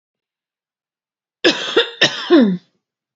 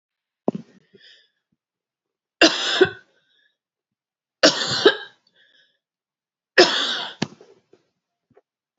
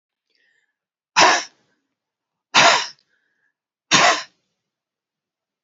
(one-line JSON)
{"cough_length": "3.2 s", "cough_amplitude": 31969, "cough_signal_mean_std_ratio": 0.39, "three_cough_length": "8.8 s", "three_cough_amplitude": 32767, "three_cough_signal_mean_std_ratio": 0.27, "exhalation_length": "5.6 s", "exhalation_amplitude": 32731, "exhalation_signal_mean_std_ratio": 0.3, "survey_phase": "beta (2021-08-13 to 2022-03-07)", "age": "45-64", "gender": "Female", "wearing_mask": "No", "symptom_abdominal_pain": true, "symptom_fatigue": true, "symptom_headache": true, "symptom_change_to_sense_of_smell_or_taste": true, "symptom_loss_of_taste": true, "smoker_status": "Ex-smoker", "respiratory_condition_asthma": true, "respiratory_condition_other": true, "recruitment_source": "REACT", "submission_delay": "1 day", "covid_test_result": "Negative", "covid_test_method": "RT-qPCR", "influenza_a_test_result": "Negative", "influenza_b_test_result": "Negative"}